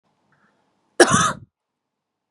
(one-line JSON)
{"cough_length": "2.3 s", "cough_amplitude": 32767, "cough_signal_mean_std_ratio": 0.27, "survey_phase": "beta (2021-08-13 to 2022-03-07)", "age": "18-44", "gender": "Female", "wearing_mask": "No", "symptom_none": true, "smoker_status": "Never smoked", "respiratory_condition_asthma": false, "respiratory_condition_other": false, "recruitment_source": "REACT", "submission_delay": "0 days", "covid_test_result": "Negative", "covid_test_method": "RT-qPCR", "influenza_a_test_result": "Negative", "influenza_b_test_result": "Negative"}